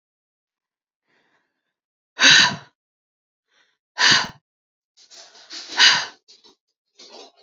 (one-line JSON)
{"exhalation_length": "7.4 s", "exhalation_amplitude": 31319, "exhalation_signal_mean_std_ratio": 0.28, "survey_phase": "beta (2021-08-13 to 2022-03-07)", "age": "45-64", "gender": "Female", "wearing_mask": "No", "symptom_fatigue": true, "symptom_onset": "13 days", "smoker_status": "Ex-smoker", "respiratory_condition_asthma": false, "respiratory_condition_other": false, "recruitment_source": "REACT", "submission_delay": "3 days", "covid_test_result": "Negative", "covid_test_method": "RT-qPCR"}